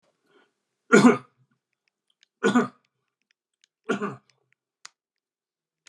{"three_cough_length": "5.9 s", "three_cough_amplitude": 25283, "three_cough_signal_mean_std_ratio": 0.23, "survey_phase": "beta (2021-08-13 to 2022-03-07)", "age": "45-64", "gender": "Male", "wearing_mask": "No", "symptom_none": true, "smoker_status": "Ex-smoker", "respiratory_condition_asthma": false, "respiratory_condition_other": false, "recruitment_source": "REACT", "submission_delay": "3 days", "covid_test_result": "Negative", "covid_test_method": "RT-qPCR", "influenza_a_test_result": "Negative", "influenza_b_test_result": "Negative"}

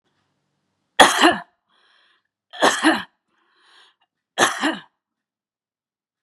{"three_cough_length": "6.2 s", "three_cough_amplitude": 32768, "three_cough_signal_mean_std_ratio": 0.29, "survey_phase": "beta (2021-08-13 to 2022-03-07)", "age": "45-64", "gender": "Female", "wearing_mask": "No", "symptom_none": true, "smoker_status": "Never smoked", "respiratory_condition_asthma": false, "respiratory_condition_other": false, "recruitment_source": "Test and Trace", "submission_delay": "2 days", "covid_test_result": "Positive", "covid_test_method": "RT-qPCR"}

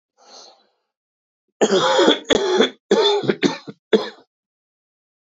{"cough_length": "5.3 s", "cough_amplitude": 26574, "cough_signal_mean_std_ratio": 0.45, "survey_phase": "beta (2021-08-13 to 2022-03-07)", "age": "45-64", "gender": "Male", "wearing_mask": "No", "symptom_none": true, "smoker_status": "Current smoker (1 to 10 cigarettes per day)", "respiratory_condition_asthma": true, "respiratory_condition_other": false, "recruitment_source": "Test and Trace", "submission_delay": "0 days", "covid_test_result": "Negative", "covid_test_method": "LFT"}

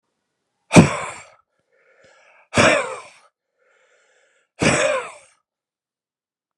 {"exhalation_length": "6.6 s", "exhalation_amplitude": 32768, "exhalation_signal_mean_std_ratio": 0.29, "survey_phase": "beta (2021-08-13 to 2022-03-07)", "age": "45-64", "gender": "Male", "wearing_mask": "Yes", "symptom_runny_or_blocked_nose": true, "symptom_sore_throat": true, "symptom_fever_high_temperature": true, "symptom_headache": true, "symptom_loss_of_taste": true, "symptom_other": true, "smoker_status": "Never smoked", "respiratory_condition_asthma": false, "respiratory_condition_other": false, "recruitment_source": "Test and Trace", "submission_delay": "2 days", "covid_test_result": "Positive", "covid_test_method": "RT-qPCR"}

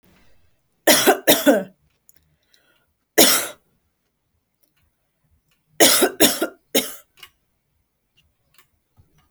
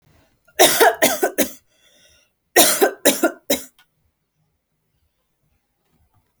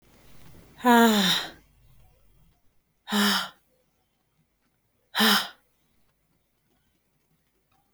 {"three_cough_length": "9.3 s", "three_cough_amplitude": 32768, "three_cough_signal_mean_std_ratio": 0.31, "cough_length": "6.4 s", "cough_amplitude": 32768, "cough_signal_mean_std_ratio": 0.34, "exhalation_length": "7.9 s", "exhalation_amplitude": 15177, "exhalation_signal_mean_std_ratio": 0.33, "survey_phase": "alpha (2021-03-01 to 2021-08-12)", "age": "18-44", "gender": "Female", "wearing_mask": "No", "symptom_shortness_of_breath": true, "symptom_fatigue": true, "symptom_headache": true, "symptom_onset": "12 days", "smoker_status": "Never smoked", "respiratory_condition_asthma": false, "respiratory_condition_other": false, "recruitment_source": "REACT", "submission_delay": "2 days", "covid_test_result": "Negative", "covid_test_method": "RT-qPCR"}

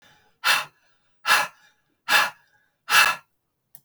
{"exhalation_length": "3.8 s", "exhalation_amplitude": 23049, "exhalation_signal_mean_std_ratio": 0.37, "survey_phase": "alpha (2021-03-01 to 2021-08-12)", "age": "45-64", "gender": "Female", "wearing_mask": "No", "symptom_cough_any": true, "symptom_change_to_sense_of_smell_or_taste": true, "symptom_loss_of_taste": true, "symptom_onset": "5 days", "smoker_status": "Never smoked", "respiratory_condition_asthma": true, "respiratory_condition_other": false, "recruitment_source": "Test and Trace", "submission_delay": "1 day", "covid_test_result": "Positive", "covid_test_method": "RT-qPCR"}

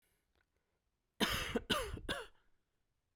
{"three_cough_length": "3.2 s", "three_cough_amplitude": 3810, "three_cough_signal_mean_std_ratio": 0.41, "survey_phase": "beta (2021-08-13 to 2022-03-07)", "age": "45-64", "gender": "Male", "wearing_mask": "No", "symptom_none": true, "smoker_status": "Never smoked", "respiratory_condition_asthma": false, "respiratory_condition_other": false, "recruitment_source": "REACT", "submission_delay": "0 days", "covid_test_result": "Negative", "covid_test_method": "RT-qPCR"}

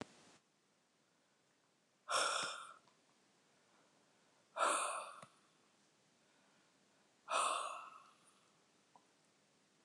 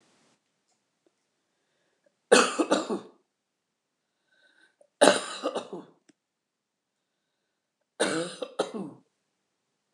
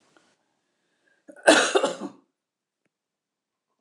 {"exhalation_length": "9.8 s", "exhalation_amplitude": 2246, "exhalation_signal_mean_std_ratio": 0.34, "three_cough_length": "9.9 s", "three_cough_amplitude": 29106, "three_cough_signal_mean_std_ratio": 0.26, "cough_length": "3.8 s", "cough_amplitude": 28296, "cough_signal_mean_std_ratio": 0.25, "survey_phase": "alpha (2021-03-01 to 2021-08-12)", "age": "65+", "gender": "Female", "wearing_mask": "No", "symptom_none": true, "smoker_status": "Ex-smoker", "respiratory_condition_asthma": false, "respiratory_condition_other": false, "recruitment_source": "REACT", "submission_delay": "2 days", "covid_test_result": "Negative", "covid_test_method": "RT-qPCR"}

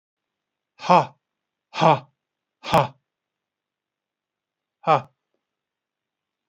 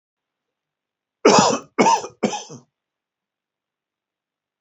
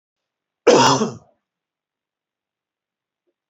{"exhalation_length": "6.5 s", "exhalation_amplitude": 29894, "exhalation_signal_mean_std_ratio": 0.23, "three_cough_length": "4.6 s", "three_cough_amplitude": 27614, "three_cough_signal_mean_std_ratio": 0.3, "cough_length": "3.5 s", "cough_amplitude": 27898, "cough_signal_mean_std_ratio": 0.27, "survey_phase": "beta (2021-08-13 to 2022-03-07)", "age": "65+", "gender": "Male", "wearing_mask": "No", "symptom_none": true, "smoker_status": "Never smoked", "respiratory_condition_asthma": false, "respiratory_condition_other": false, "recruitment_source": "REACT", "submission_delay": "1 day", "covid_test_result": "Negative", "covid_test_method": "RT-qPCR", "influenza_a_test_result": "Negative", "influenza_b_test_result": "Negative"}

